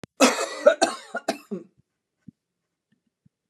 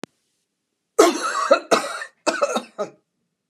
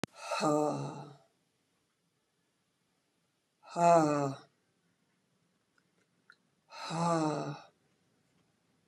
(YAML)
cough_length: 3.5 s
cough_amplitude: 32330
cough_signal_mean_std_ratio: 0.3
three_cough_length: 3.5 s
three_cough_amplitude: 32379
three_cough_signal_mean_std_ratio: 0.41
exhalation_length: 8.9 s
exhalation_amplitude: 7990
exhalation_signal_mean_std_ratio: 0.34
survey_phase: beta (2021-08-13 to 2022-03-07)
age: 45-64
gender: Female
wearing_mask: 'No'
symptom_none: true
symptom_onset: 12 days
smoker_status: Never smoked
respiratory_condition_asthma: false
respiratory_condition_other: false
recruitment_source: REACT
submission_delay: 3 days
covid_test_result: Negative
covid_test_method: RT-qPCR